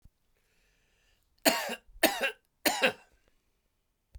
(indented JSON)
{
  "three_cough_length": "4.2 s",
  "three_cough_amplitude": 18400,
  "three_cough_signal_mean_std_ratio": 0.31,
  "survey_phase": "beta (2021-08-13 to 2022-03-07)",
  "age": "65+",
  "gender": "Male",
  "wearing_mask": "No",
  "symptom_cough_any": true,
  "symptom_runny_or_blocked_nose": true,
  "symptom_shortness_of_breath": true,
  "symptom_fatigue": true,
  "symptom_change_to_sense_of_smell_or_taste": true,
  "symptom_onset": "3 days",
  "smoker_status": "Ex-smoker",
  "respiratory_condition_asthma": false,
  "respiratory_condition_other": false,
  "recruitment_source": "Test and Trace",
  "submission_delay": "2 days",
  "covid_test_result": "Positive",
  "covid_test_method": "ePCR"
}